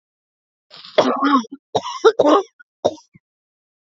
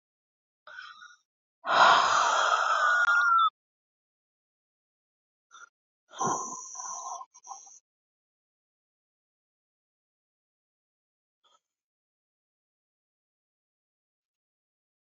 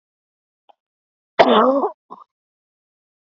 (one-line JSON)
{"three_cough_length": "3.9 s", "three_cough_amplitude": 28446, "three_cough_signal_mean_std_ratio": 0.39, "exhalation_length": "15.0 s", "exhalation_amplitude": 13002, "exhalation_signal_mean_std_ratio": 0.33, "cough_length": "3.2 s", "cough_amplitude": 28321, "cough_signal_mean_std_ratio": 0.3, "survey_phase": "beta (2021-08-13 to 2022-03-07)", "age": "18-44", "gender": "Female", "wearing_mask": "No", "symptom_cough_any": true, "symptom_new_continuous_cough": true, "symptom_runny_or_blocked_nose": true, "symptom_shortness_of_breath": true, "symptom_fatigue": true, "symptom_fever_high_temperature": true, "symptom_headache": true, "symptom_change_to_sense_of_smell_or_taste": true, "symptom_loss_of_taste": true, "symptom_other": true, "symptom_onset": "3 days", "smoker_status": "Current smoker (1 to 10 cigarettes per day)", "respiratory_condition_asthma": false, "respiratory_condition_other": false, "recruitment_source": "Test and Trace", "submission_delay": "2 days", "covid_test_result": "Positive", "covid_test_method": "RT-qPCR", "covid_ct_value": 17.8, "covid_ct_gene": "ORF1ab gene"}